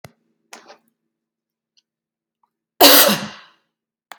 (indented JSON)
{
  "cough_length": "4.2 s",
  "cough_amplitude": 32768,
  "cough_signal_mean_std_ratio": 0.25,
  "survey_phase": "beta (2021-08-13 to 2022-03-07)",
  "age": "45-64",
  "gender": "Female",
  "wearing_mask": "No",
  "symptom_none": true,
  "symptom_onset": "13 days",
  "smoker_status": "Ex-smoker",
  "respiratory_condition_asthma": false,
  "respiratory_condition_other": false,
  "recruitment_source": "REACT",
  "submission_delay": "3 days",
  "covid_test_result": "Negative",
  "covid_test_method": "RT-qPCR",
  "influenza_a_test_result": "Negative",
  "influenza_b_test_result": "Negative"
}